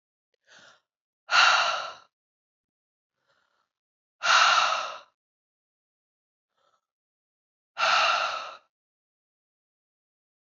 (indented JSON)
{
  "exhalation_length": "10.6 s",
  "exhalation_amplitude": 14459,
  "exhalation_signal_mean_std_ratio": 0.33,
  "survey_phase": "alpha (2021-03-01 to 2021-08-12)",
  "age": "18-44",
  "gender": "Female",
  "wearing_mask": "No",
  "symptom_cough_any": true,
  "symptom_new_continuous_cough": true,
  "symptom_abdominal_pain": true,
  "symptom_fatigue": true,
  "symptom_fever_high_temperature": true,
  "symptom_headache": true,
  "symptom_onset": "2 days",
  "smoker_status": "Never smoked",
  "respiratory_condition_asthma": false,
  "respiratory_condition_other": false,
  "recruitment_source": "Test and Trace",
  "submission_delay": "1 day",
  "covid_test_result": "Positive",
  "covid_test_method": "RT-qPCR"
}